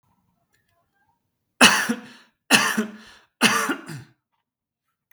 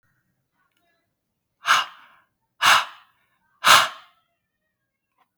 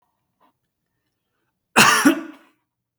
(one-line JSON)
{"three_cough_length": "5.1 s", "three_cough_amplitude": 32768, "three_cough_signal_mean_std_ratio": 0.33, "exhalation_length": "5.4 s", "exhalation_amplitude": 32766, "exhalation_signal_mean_std_ratio": 0.26, "cough_length": "3.0 s", "cough_amplitude": 32768, "cough_signal_mean_std_ratio": 0.29, "survey_phase": "beta (2021-08-13 to 2022-03-07)", "age": "18-44", "gender": "Male", "wearing_mask": "No", "symptom_none": true, "smoker_status": "Never smoked", "respiratory_condition_asthma": false, "respiratory_condition_other": false, "recruitment_source": "REACT", "submission_delay": "9 days", "covid_test_result": "Negative", "covid_test_method": "RT-qPCR"}